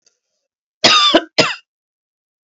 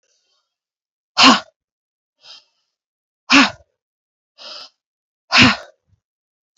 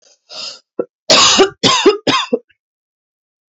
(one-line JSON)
{"cough_length": "2.5 s", "cough_amplitude": 32768, "cough_signal_mean_std_ratio": 0.37, "exhalation_length": "6.6 s", "exhalation_amplitude": 32619, "exhalation_signal_mean_std_ratio": 0.25, "three_cough_length": "3.5 s", "three_cough_amplitude": 32768, "three_cough_signal_mean_std_ratio": 0.46, "survey_phase": "beta (2021-08-13 to 2022-03-07)", "age": "18-44", "gender": "Female", "wearing_mask": "No", "symptom_cough_any": true, "symptom_runny_or_blocked_nose": true, "symptom_shortness_of_breath": true, "symptom_sore_throat": true, "symptom_fatigue": true, "symptom_headache": true, "symptom_change_to_sense_of_smell_or_taste": true, "symptom_onset": "3 days", "smoker_status": "Ex-smoker", "respiratory_condition_asthma": true, "respiratory_condition_other": false, "recruitment_source": "Test and Trace", "submission_delay": "1 day", "covid_test_result": "Positive", "covid_test_method": "RT-qPCR", "covid_ct_value": 19.3, "covid_ct_gene": "ORF1ab gene"}